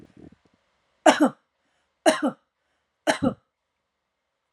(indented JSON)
{
  "three_cough_length": "4.5 s",
  "three_cough_amplitude": 28828,
  "three_cough_signal_mean_std_ratio": 0.27,
  "survey_phase": "alpha (2021-03-01 to 2021-08-12)",
  "age": "45-64",
  "gender": "Female",
  "wearing_mask": "No",
  "symptom_none": true,
  "smoker_status": "Never smoked",
  "respiratory_condition_asthma": false,
  "respiratory_condition_other": false,
  "recruitment_source": "REACT",
  "submission_delay": "2 days",
  "covid_test_result": "Negative",
  "covid_test_method": "RT-qPCR"
}